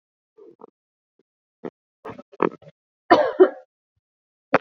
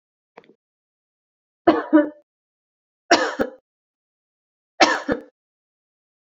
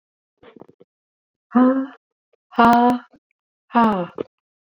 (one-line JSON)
{"cough_length": "4.6 s", "cough_amplitude": 27576, "cough_signal_mean_std_ratio": 0.22, "three_cough_length": "6.2 s", "three_cough_amplitude": 31532, "three_cough_signal_mean_std_ratio": 0.27, "exhalation_length": "4.8 s", "exhalation_amplitude": 26412, "exhalation_signal_mean_std_ratio": 0.38, "survey_phase": "beta (2021-08-13 to 2022-03-07)", "age": "45-64", "gender": "Female", "wearing_mask": "No", "symptom_runny_or_blocked_nose": true, "smoker_status": "Never smoked", "respiratory_condition_asthma": false, "respiratory_condition_other": false, "recruitment_source": "REACT", "submission_delay": "1 day", "covid_test_result": "Negative", "covid_test_method": "RT-qPCR"}